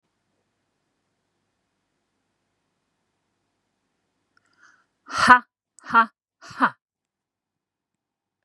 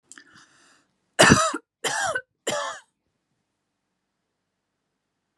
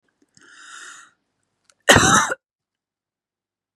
{"exhalation_length": "8.4 s", "exhalation_amplitude": 32160, "exhalation_signal_mean_std_ratio": 0.17, "three_cough_length": "5.4 s", "three_cough_amplitude": 31610, "three_cough_signal_mean_std_ratio": 0.28, "cough_length": "3.8 s", "cough_amplitude": 32768, "cough_signal_mean_std_ratio": 0.27, "survey_phase": "beta (2021-08-13 to 2022-03-07)", "age": "45-64", "gender": "Female", "wearing_mask": "No", "symptom_none": true, "smoker_status": "Never smoked", "respiratory_condition_asthma": false, "respiratory_condition_other": false, "recruitment_source": "REACT", "submission_delay": "2 days", "covid_test_result": "Negative", "covid_test_method": "RT-qPCR"}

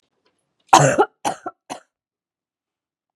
{"cough_length": "3.2 s", "cough_amplitude": 32768, "cough_signal_mean_std_ratio": 0.26, "survey_phase": "beta (2021-08-13 to 2022-03-07)", "age": "18-44", "gender": "Female", "wearing_mask": "No", "symptom_runny_or_blocked_nose": true, "symptom_sore_throat": true, "symptom_headache": true, "smoker_status": "Never smoked", "respiratory_condition_asthma": false, "respiratory_condition_other": false, "recruitment_source": "Test and Trace", "submission_delay": "1 day", "covid_test_result": "Positive", "covid_test_method": "RT-qPCR", "covid_ct_value": 17.5, "covid_ct_gene": "ORF1ab gene", "covid_ct_mean": 18.9, "covid_viral_load": "620000 copies/ml", "covid_viral_load_category": "Low viral load (10K-1M copies/ml)"}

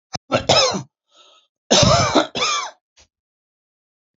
{"cough_length": "4.2 s", "cough_amplitude": 32768, "cough_signal_mean_std_ratio": 0.44, "survey_phase": "alpha (2021-03-01 to 2021-08-12)", "age": "45-64", "gender": "Male", "wearing_mask": "No", "symptom_none": true, "smoker_status": "Ex-smoker", "respiratory_condition_asthma": false, "respiratory_condition_other": false, "recruitment_source": "REACT", "submission_delay": "2 days", "covid_test_result": "Negative", "covid_test_method": "RT-qPCR"}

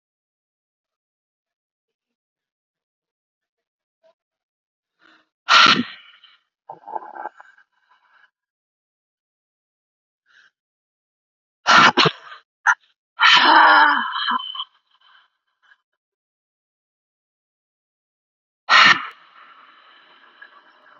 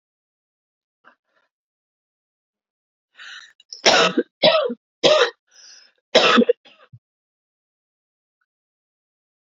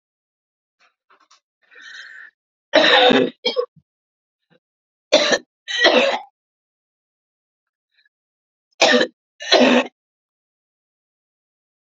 {"exhalation_length": "21.0 s", "exhalation_amplitude": 30491, "exhalation_signal_mean_std_ratio": 0.26, "cough_length": "9.5 s", "cough_amplitude": 29915, "cough_signal_mean_std_ratio": 0.29, "three_cough_length": "11.9 s", "three_cough_amplitude": 32768, "three_cough_signal_mean_std_ratio": 0.33, "survey_phase": "beta (2021-08-13 to 2022-03-07)", "age": "45-64", "gender": "Female", "wearing_mask": "No", "symptom_cough_any": true, "symptom_runny_or_blocked_nose": true, "symptom_sore_throat": true, "symptom_fatigue": true, "symptom_fever_high_temperature": true, "symptom_headache": true, "symptom_other": true, "smoker_status": "Current smoker (1 to 10 cigarettes per day)", "respiratory_condition_asthma": true, "respiratory_condition_other": false, "recruitment_source": "Test and Trace", "submission_delay": "2 days", "covid_test_result": "Positive", "covid_test_method": "LFT"}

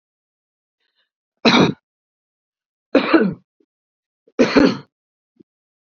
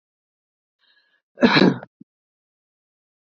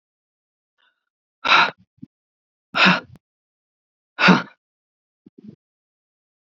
{"three_cough_length": "6.0 s", "three_cough_amplitude": 29849, "three_cough_signal_mean_std_ratio": 0.31, "cough_length": "3.2 s", "cough_amplitude": 27680, "cough_signal_mean_std_ratio": 0.24, "exhalation_length": "6.5 s", "exhalation_amplitude": 26618, "exhalation_signal_mean_std_ratio": 0.26, "survey_phase": "beta (2021-08-13 to 2022-03-07)", "age": "65+", "gender": "Female", "wearing_mask": "No", "symptom_none": true, "smoker_status": "Never smoked", "respiratory_condition_asthma": false, "respiratory_condition_other": false, "recruitment_source": "REACT", "submission_delay": "1 day", "covid_test_result": "Negative", "covid_test_method": "RT-qPCR", "influenza_a_test_result": "Negative", "influenza_b_test_result": "Negative"}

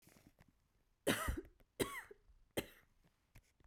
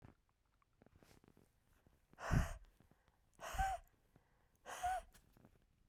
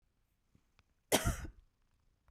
{"three_cough_length": "3.7 s", "three_cough_amplitude": 3374, "three_cough_signal_mean_std_ratio": 0.33, "exhalation_length": "5.9 s", "exhalation_amplitude": 2458, "exhalation_signal_mean_std_ratio": 0.33, "cough_length": "2.3 s", "cough_amplitude": 5728, "cough_signal_mean_std_ratio": 0.27, "survey_phase": "beta (2021-08-13 to 2022-03-07)", "age": "45-64", "gender": "Female", "wearing_mask": "No", "symptom_none": true, "smoker_status": "Never smoked", "respiratory_condition_asthma": false, "respiratory_condition_other": false, "recruitment_source": "REACT", "submission_delay": "1 day", "covid_test_result": "Negative", "covid_test_method": "RT-qPCR", "influenza_a_test_result": "Negative", "influenza_b_test_result": "Negative"}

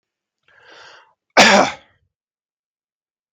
{"cough_length": "3.3 s", "cough_amplitude": 32768, "cough_signal_mean_std_ratio": 0.25, "survey_phase": "beta (2021-08-13 to 2022-03-07)", "age": "18-44", "gender": "Male", "wearing_mask": "No", "symptom_none": true, "smoker_status": "Never smoked", "respiratory_condition_asthma": false, "respiratory_condition_other": false, "recruitment_source": "REACT", "submission_delay": "3 days", "covid_test_result": "Negative", "covid_test_method": "RT-qPCR", "influenza_a_test_result": "Negative", "influenza_b_test_result": "Negative"}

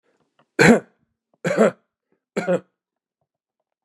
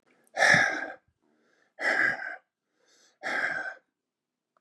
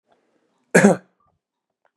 {"three_cough_length": "3.8 s", "three_cough_amplitude": 29898, "three_cough_signal_mean_std_ratio": 0.3, "exhalation_length": "4.6 s", "exhalation_amplitude": 14094, "exhalation_signal_mean_std_ratio": 0.42, "cough_length": "2.0 s", "cough_amplitude": 32514, "cough_signal_mean_std_ratio": 0.25, "survey_phase": "beta (2021-08-13 to 2022-03-07)", "age": "45-64", "gender": "Male", "wearing_mask": "No", "symptom_runny_or_blocked_nose": true, "symptom_fatigue": true, "symptom_onset": "6 days", "smoker_status": "Never smoked", "respiratory_condition_asthma": false, "respiratory_condition_other": false, "recruitment_source": "REACT", "submission_delay": "1 day", "covid_test_result": "Negative", "covid_test_method": "RT-qPCR", "influenza_a_test_result": "Negative", "influenza_b_test_result": "Negative"}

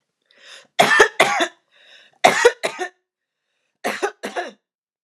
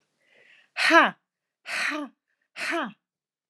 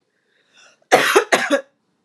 {"three_cough_length": "5.0 s", "three_cough_amplitude": 29204, "three_cough_signal_mean_std_ratio": 0.37, "exhalation_length": "3.5 s", "exhalation_amplitude": 23258, "exhalation_signal_mean_std_ratio": 0.35, "cough_length": "2.0 s", "cough_amplitude": 29204, "cough_signal_mean_std_ratio": 0.41, "survey_phase": "alpha (2021-03-01 to 2021-08-12)", "age": "18-44", "gender": "Female", "wearing_mask": "No", "symptom_none": true, "smoker_status": "Never smoked", "respiratory_condition_asthma": false, "respiratory_condition_other": false, "recruitment_source": "REACT", "submission_delay": "1 day", "covid_test_result": "Negative", "covid_test_method": "RT-qPCR"}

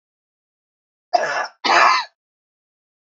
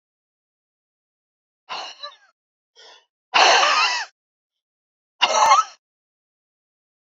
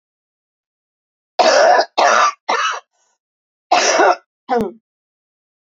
{"three_cough_length": "3.1 s", "three_cough_amplitude": 27389, "three_cough_signal_mean_std_ratio": 0.36, "exhalation_length": "7.2 s", "exhalation_amplitude": 29713, "exhalation_signal_mean_std_ratio": 0.33, "cough_length": "5.6 s", "cough_amplitude": 29258, "cough_signal_mean_std_ratio": 0.46, "survey_phase": "beta (2021-08-13 to 2022-03-07)", "age": "65+", "gender": "Female", "wearing_mask": "No", "symptom_cough_any": true, "symptom_runny_or_blocked_nose": true, "symptom_sore_throat": true, "symptom_fatigue": true, "symptom_headache": true, "symptom_onset": "4 days", "smoker_status": "Never smoked", "respiratory_condition_asthma": false, "respiratory_condition_other": false, "recruitment_source": "Test and Trace", "submission_delay": "1 day", "covid_test_result": "Positive", "covid_test_method": "RT-qPCR", "covid_ct_value": 25.4, "covid_ct_gene": "N gene"}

